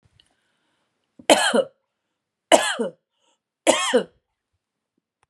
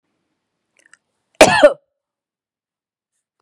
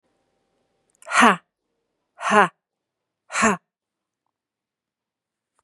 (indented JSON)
{
  "three_cough_length": "5.3 s",
  "three_cough_amplitude": 32767,
  "three_cough_signal_mean_std_ratio": 0.3,
  "cough_length": "3.4 s",
  "cough_amplitude": 32768,
  "cough_signal_mean_std_ratio": 0.22,
  "exhalation_length": "5.6 s",
  "exhalation_amplitude": 32272,
  "exhalation_signal_mean_std_ratio": 0.25,
  "survey_phase": "beta (2021-08-13 to 2022-03-07)",
  "age": "45-64",
  "gender": "Female",
  "wearing_mask": "No",
  "symptom_runny_or_blocked_nose": true,
  "symptom_diarrhoea": true,
  "symptom_fatigue": true,
  "symptom_onset": "12 days",
  "smoker_status": "Never smoked",
  "respiratory_condition_asthma": false,
  "respiratory_condition_other": false,
  "recruitment_source": "REACT",
  "submission_delay": "1 day",
  "covid_test_result": "Negative",
  "covid_test_method": "RT-qPCR",
  "influenza_a_test_result": "Negative",
  "influenza_b_test_result": "Negative"
}